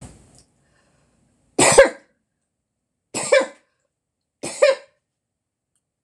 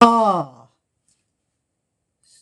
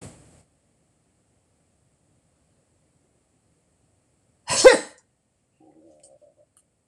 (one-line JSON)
{"three_cough_length": "6.0 s", "three_cough_amplitude": 26028, "three_cough_signal_mean_std_ratio": 0.26, "exhalation_length": "2.4 s", "exhalation_amplitude": 26028, "exhalation_signal_mean_std_ratio": 0.32, "cough_length": "6.9 s", "cough_amplitude": 26028, "cough_signal_mean_std_ratio": 0.14, "survey_phase": "beta (2021-08-13 to 2022-03-07)", "age": "65+", "gender": "Female", "wearing_mask": "No", "symptom_cough_any": true, "symptom_sore_throat": true, "symptom_onset": "12 days", "smoker_status": "Never smoked", "respiratory_condition_asthma": false, "respiratory_condition_other": false, "recruitment_source": "REACT", "submission_delay": "1 day", "covid_test_result": "Negative", "covid_test_method": "RT-qPCR", "influenza_a_test_result": "Unknown/Void", "influenza_b_test_result": "Unknown/Void"}